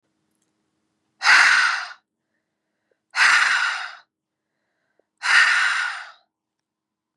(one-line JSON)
{"exhalation_length": "7.2 s", "exhalation_amplitude": 26303, "exhalation_signal_mean_std_ratio": 0.43, "survey_phase": "beta (2021-08-13 to 2022-03-07)", "age": "18-44", "gender": "Female", "wearing_mask": "No", "symptom_cough_any": true, "symptom_runny_or_blocked_nose": true, "smoker_status": "Ex-smoker", "respiratory_condition_asthma": false, "respiratory_condition_other": false, "recruitment_source": "Test and Trace", "submission_delay": "2 days", "covid_test_result": "Negative", "covid_test_method": "RT-qPCR"}